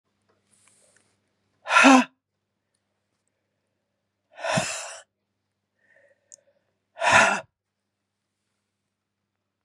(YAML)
exhalation_length: 9.6 s
exhalation_amplitude: 26000
exhalation_signal_mean_std_ratio: 0.24
survey_phase: beta (2021-08-13 to 2022-03-07)
age: 45-64
gender: Female
wearing_mask: 'No'
symptom_cough_any: true
symptom_runny_or_blocked_nose: true
symptom_sore_throat: true
symptom_fatigue: true
symptom_fever_high_temperature: true
symptom_headache: true
symptom_onset: 4 days
smoker_status: Never smoked
respiratory_condition_asthma: false
respiratory_condition_other: false
recruitment_source: Test and Trace
submission_delay: 1 day
covid_test_result: Positive
covid_test_method: RT-qPCR
covid_ct_value: 14.3
covid_ct_gene: ORF1ab gene
covid_ct_mean: 14.5
covid_viral_load: 18000000 copies/ml
covid_viral_load_category: High viral load (>1M copies/ml)